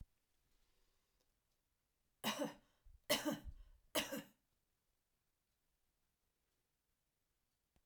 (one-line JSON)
{"three_cough_length": "7.9 s", "three_cough_amplitude": 2333, "three_cough_signal_mean_std_ratio": 0.27, "survey_phase": "alpha (2021-03-01 to 2021-08-12)", "age": "65+", "gender": "Female", "wearing_mask": "No", "symptom_none": true, "symptom_onset": "12 days", "smoker_status": "Ex-smoker", "respiratory_condition_asthma": false, "respiratory_condition_other": false, "recruitment_source": "REACT", "submission_delay": "1 day", "covid_test_result": "Negative", "covid_test_method": "RT-qPCR"}